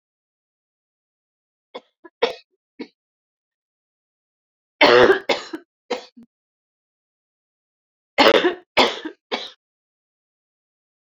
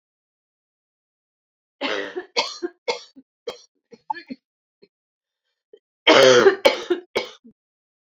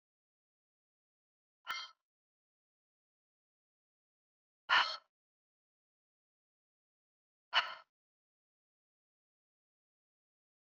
{"three_cough_length": "11.0 s", "three_cough_amplitude": 31107, "three_cough_signal_mean_std_ratio": 0.25, "cough_length": "8.0 s", "cough_amplitude": 32361, "cough_signal_mean_std_ratio": 0.29, "exhalation_length": "10.7 s", "exhalation_amplitude": 4569, "exhalation_signal_mean_std_ratio": 0.15, "survey_phase": "beta (2021-08-13 to 2022-03-07)", "age": "45-64", "gender": "Female", "wearing_mask": "No", "symptom_cough_any": true, "symptom_new_continuous_cough": true, "symptom_runny_or_blocked_nose": true, "symptom_shortness_of_breath": true, "symptom_fatigue": true, "symptom_headache": true, "symptom_change_to_sense_of_smell_or_taste": true, "symptom_loss_of_taste": true, "symptom_onset": "4 days", "smoker_status": "Ex-smoker", "respiratory_condition_asthma": false, "respiratory_condition_other": false, "recruitment_source": "Test and Trace", "submission_delay": "2 days", "covid_test_result": "Positive", "covid_test_method": "RT-qPCR", "covid_ct_value": 15.1, "covid_ct_gene": "ORF1ab gene", "covid_ct_mean": 15.4, "covid_viral_load": "9000000 copies/ml", "covid_viral_load_category": "High viral load (>1M copies/ml)"}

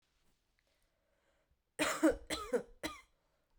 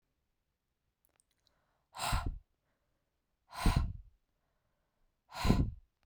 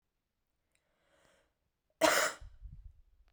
{"three_cough_length": "3.6 s", "three_cough_amplitude": 4048, "three_cough_signal_mean_std_ratio": 0.32, "exhalation_length": "6.1 s", "exhalation_amplitude": 8879, "exhalation_signal_mean_std_ratio": 0.31, "cough_length": "3.3 s", "cough_amplitude": 6818, "cough_signal_mean_std_ratio": 0.27, "survey_phase": "beta (2021-08-13 to 2022-03-07)", "age": "18-44", "gender": "Female", "wearing_mask": "No", "symptom_none": true, "symptom_onset": "7 days", "smoker_status": "Current smoker (1 to 10 cigarettes per day)", "respiratory_condition_asthma": false, "respiratory_condition_other": false, "recruitment_source": "REACT", "submission_delay": "1 day", "covid_test_result": "Negative", "covid_test_method": "RT-qPCR"}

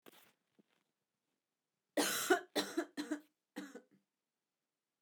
{"cough_length": "5.0 s", "cough_amplitude": 4433, "cough_signal_mean_std_ratio": 0.31, "survey_phase": "beta (2021-08-13 to 2022-03-07)", "age": "45-64", "gender": "Female", "wearing_mask": "No", "symptom_cough_any": true, "symptom_new_continuous_cough": true, "symptom_onset": "12 days", "smoker_status": "Never smoked", "respiratory_condition_asthma": false, "respiratory_condition_other": false, "recruitment_source": "REACT", "submission_delay": "2 days", "covid_test_result": "Negative", "covid_test_method": "RT-qPCR"}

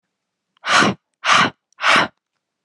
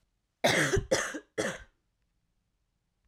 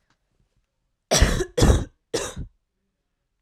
{"exhalation_length": "2.6 s", "exhalation_amplitude": 30630, "exhalation_signal_mean_std_ratio": 0.45, "cough_length": "3.1 s", "cough_amplitude": 7994, "cough_signal_mean_std_ratio": 0.41, "three_cough_length": "3.4 s", "three_cough_amplitude": 24377, "three_cough_signal_mean_std_ratio": 0.36, "survey_phase": "alpha (2021-03-01 to 2021-08-12)", "age": "18-44", "gender": "Female", "wearing_mask": "No", "symptom_cough_any": true, "symptom_new_continuous_cough": true, "symptom_shortness_of_breath": true, "symptom_abdominal_pain": true, "symptom_fatigue": true, "symptom_headache": true, "smoker_status": "Current smoker (e-cigarettes or vapes only)", "respiratory_condition_asthma": false, "respiratory_condition_other": false, "recruitment_source": "Test and Trace", "submission_delay": "1 day", "covid_test_result": "Positive", "covid_test_method": "LFT"}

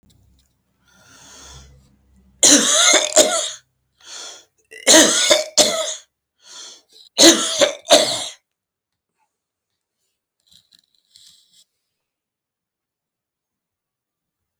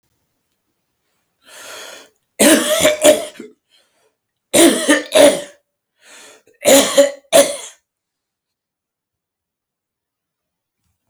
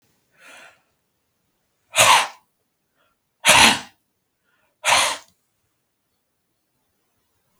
{"three_cough_length": "14.6 s", "three_cough_amplitude": 32768, "three_cough_signal_mean_std_ratio": 0.33, "cough_length": "11.1 s", "cough_amplitude": 32768, "cough_signal_mean_std_ratio": 0.35, "exhalation_length": "7.6 s", "exhalation_amplitude": 32768, "exhalation_signal_mean_std_ratio": 0.27, "survey_phase": "beta (2021-08-13 to 2022-03-07)", "age": "65+", "gender": "Male", "wearing_mask": "No", "symptom_runny_or_blocked_nose": true, "symptom_shortness_of_breath": true, "symptom_other": true, "symptom_onset": "12 days", "smoker_status": "Never smoked", "respiratory_condition_asthma": false, "respiratory_condition_other": false, "recruitment_source": "REACT", "submission_delay": "3 days", "covid_test_result": "Negative", "covid_test_method": "RT-qPCR", "influenza_a_test_result": "Negative", "influenza_b_test_result": "Negative"}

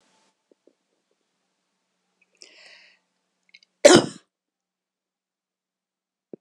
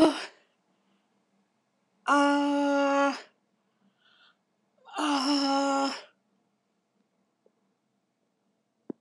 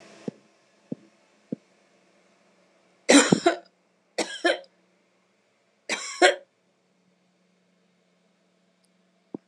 {"cough_length": "6.4 s", "cough_amplitude": 26028, "cough_signal_mean_std_ratio": 0.14, "exhalation_length": "9.0 s", "exhalation_amplitude": 11309, "exhalation_signal_mean_std_ratio": 0.43, "three_cough_length": "9.5 s", "three_cough_amplitude": 22950, "three_cough_signal_mean_std_ratio": 0.23, "survey_phase": "beta (2021-08-13 to 2022-03-07)", "age": "65+", "gender": "Female", "wearing_mask": "No", "symptom_none": true, "symptom_onset": "4 days", "smoker_status": "Never smoked", "respiratory_condition_asthma": false, "respiratory_condition_other": false, "recruitment_source": "Test and Trace", "submission_delay": "1 day", "covid_test_result": "Positive", "covid_test_method": "RT-qPCR", "covid_ct_value": 29.2, "covid_ct_gene": "N gene"}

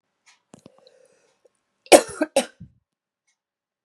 {"cough_length": "3.8 s", "cough_amplitude": 32768, "cough_signal_mean_std_ratio": 0.17, "survey_phase": "beta (2021-08-13 to 2022-03-07)", "age": "45-64", "gender": "Female", "wearing_mask": "No", "symptom_cough_any": true, "symptom_runny_or_blocked_nose": true, "symptom_shortness_of_breath": true, "symptom_sore_throat": true, "symptom_fatigue": true, "symptom_fever_high_temperature": true, "symptom_headache": true, "symptom_other": true, "symptom_onset": "4 days", "smoker_status": "Never smoked", "respiratory_condition_asthma": false, "respiratory_condition_other": false, "recruitment_source": "Test and Trace", "submission_delay": "2 days", "covid_test_result": "Positive", "covid_test_method": "RT-qPCR", "covid_ct_value": 18.4, "covid_ct_gene": "ORF1ab gene"}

